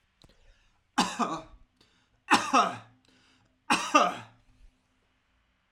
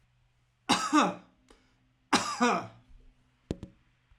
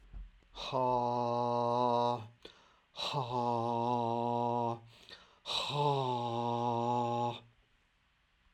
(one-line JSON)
{"three_cough_length": "5.7 s", "three_cough_amplitude": 16264, "three_cough_signal_mean_std_ratio": 0.33, "cough_length": "4.2 s", "cough_amplitude": 12641, "cough_signal_mean_std_ratio": 0.37, "exhalation_length": "8.5 s", "exhalation_amplitude": 3929, "exhalation_signal_mean_std_ratio": 0.77, "survey_phase": "alpha (2021-03-01 to 2021-08-12)", "age": "45-64", "gender": "Male", "wearing_mask": "No", "symptom_none": true, "smoker_status": "Never smoked", "respiratory_condition_asthma": false, "respiratory_condition_other": false, "recruitment_source": "REACT", "submission_delay": "2 days", "covid_test_result": "Negative", "covid_test_method": "RT-qPCR"}